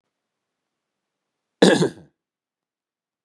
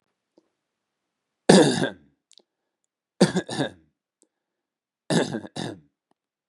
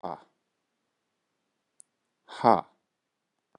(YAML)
cough_length: 3.2 s
cough_amplitude: 32196
cough_signal_mean_std_ratio: 0.21
three_cough_length: 6.5 s
three_cough_amplitude: 32767
three_cough_signal_mean_std_ratio: 0.27
exhalation_length: 3.6 s
exhalation_amplitude: 18525
exhalation_signal_mean_std_ratio: 0.15
survey_phase: beta (2021-08-13 to 2022-03-07)
age: 18-44
gender: Male
wearing_mask: 'No'
symptom_none: true
smoker_status: Current smoker (1 to 10 cigarettes per day)
respiratory_condition_asthma: false
respiratory_condition_other: false
recruitment_source: REACT
submission_delay: 1 day
covid_test_result: Negative
covid_test_method: RT-qPCR
influenza_a_test_result: Unknown/Void
influenza_b_test_result: Unknown/Void